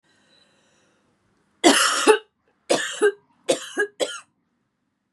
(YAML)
three_cough_length: 5.1 s
three_cough_amplitude: 30322
three_cough_signal_mean_std_ratio: 0.36
survey_phase: beta (2021-08-13 to 2022-03-07)
age: 18-44
gender: Female
wearing_mask: 'No'
symptom_cough_any: true
symptom_new_continuous_cough: true
symptom_runny_or_blocked_nose: true
symptom_onset: 5 days
smoker_status: Never smoked
respiratory_condition_asthma: false
respiratory_condition_other: false
recruitment_source: Test and Trace
submission_delay: 2 days
covid_test_result: Positive
covid_test_method: RT-qPCR
covid_ct_value: 30.5
covid_ct_gene: N gene